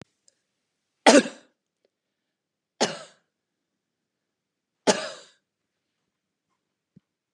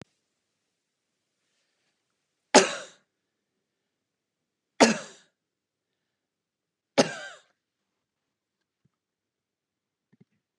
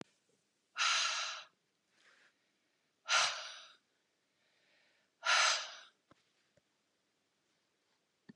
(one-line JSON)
{"cough_length": "7.3 s", "cough_amplitude": 32547, "cough_signal_mean_std_ratio": 0.17, "three_cough_length": "10.6 s", "three_cough_amplitude": 27488, "three_cough_signal_mean_std_ratio": 0.15, "exhalation_length": "8.4 s", "exhalation_amplitude": 4655, "exhalation_signal_mean_std_ratio": 0.32, "survey_phase": "beta (2021-08-13 to 2022-03-07)", "age": "45-64", "gender": "Female", "wearing_mask": "No", "symptom_none": true, "smoker_status": "Never smoked", "respiratory_condition_asthma": false, "respiratory_condition_other": false, "recruitment_source": "REACT", "submission_delay": "3 days", "covid_test_result": "Negative", "covid_test_method": "RT-qPCR", "influenza_a_test_result": "Negative", "influenza_b_test_result": "Negative"}